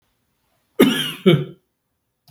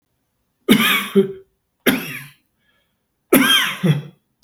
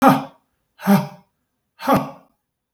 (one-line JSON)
{"cough_length": "2.3 s", "cough_amplitude": 32768, "cough_signal_mean_std_ratio": 0.34, "three_cough_length": "4.4 s", "three_cough_amplitude": 32768, "three_cough_signal_mean_std_ratio": 0.45, "exhalation_length": "2.7 s", "exhalation_amplitude": 32051, "exhalation_signal_mean_std_ratio": 0.38, "survey_phase": "beta (2021-08-13 to 2022-03-07)", "age": "45-64", "gender": "Male", "wearing_mask": "No", "symptom_none": true, "smoker_status": "Ex-smoker", "respiratory_condition_asthma": false, "respiratory_condition_other": false, "recruitment_source": "REACT", "submission_delay": "1 day", "covid_test_result": "Negative", "covid_test_method": "RT-qPCR", "influenza_a_test_result": "Negative", "influenza_b_test_result": "Negative"}